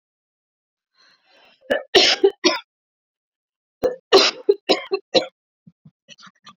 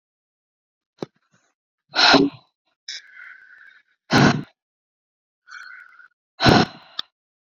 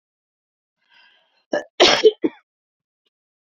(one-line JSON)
{"three_cough_length": "6.6 s", "three_cough_amplitude": 29235, "three_cough_signal_mean_std_ratio": 0.31, "exhalation_length": "7.5 s", "exhalation_amplitude": 29452, "exhalation_signal_mean_std_ratio": 0.29, "cough_length": "3.4 s", "cough_amplitude": 28539, "cough_signal_mean_std_ratio": 0.26, "survey_phase": "beta (2021-08-13 to 2022-03-07)", "age": "18-44", "gender": "Female", "wearing_mask": "No", "symptom_none": true, "smoker_status": "Never smoked", "respiratory_condition_asthma": false, "respiratory_condition_other": false, "recruitment_source": "REACT", "submission_delay": "1 day", "covid_test_result": "Negative", "covid_test_method": "RT-qPCR", "influenza_a_test_result": "Negative", "influenza_b_test_result": "Negative"}